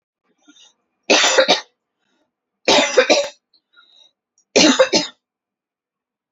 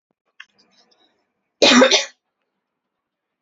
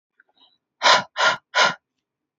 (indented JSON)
{
  "three_cough_length": "6.3 s",
  "three_cough_amplitude": 30499,
  "three_cough_signal_mean_std_ratio": 0.38,
  "cough_length": "3.4 s",
  "cough_amplitude": 30597,
  "cough_signal_mean_std_ratio": 0.28,
  "exhalation_length": "2.4 s",
  "exhalation_amplitude": 25999,
  "exhalation_signal_mean_std_ratio": 0.38,
  "survey_phase": "beta (2021-08-13 to 2022-03-07)",
  "age": "18-44",
  "gender": "Female",
  "wearing_mask": "No",
  "symptom_none": true,
  "smoker_status": "Never smoked",
  "respiratory_condition_asthma": false,
  "respiratory_condition_other": false,
  "recruitment_source": "REACT",
  "submission_delay": "2 days",
  "covid_test_result": "Negative",
  "covid_test_method": "RT-qPCR",
  "influenza_a_test_result": "Negative",
  "influenza_b_test_result": "Negative"
}